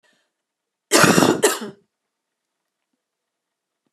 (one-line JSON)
{"cough_length": "3.9 s", "cough_amplitude": 32489, "cough_signal_mean_std_ratio": 0.3, "survey_phase": "beta (2021-08-13 to 2022-03-07)", "age": "45-64", "gender": "Female", "wearing_mask": "No", "symptom_headache": true, "smoker_status": "Current smoker (1 to 10 cigarettes per day)", "respiratory_condition_asthma": false, "respiratory_condition_other": false, "recruitment_source": "Test and Trace", "submission_delay": "1 day", "covid_test_result": "Positive", "covid_test_method": "RT-qPCR", "covid_ct_value": 32.4, "covid_ct_gene": "ORF1ab gene"}